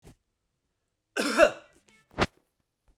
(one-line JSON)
{"cough_length": "3.0 s", "cough_amplitude": 17923, "cough_signal_mean_std_ratio": 0.26, "survey_phase": "beta (2021-08-13 to 2022-03-07)", "age": "65+", "gender": "Male", "wearing_mask": "No", "symptom_none": true, "smoker_status": "Never smoked", "respiratory_condition_asthma": false, "respiratory_condition_other": false, "recruitment_source": "REACT", "submission_delay": "1 day", "covid_test_result": "Negative", "covid_test_method": "RT-qPCR"}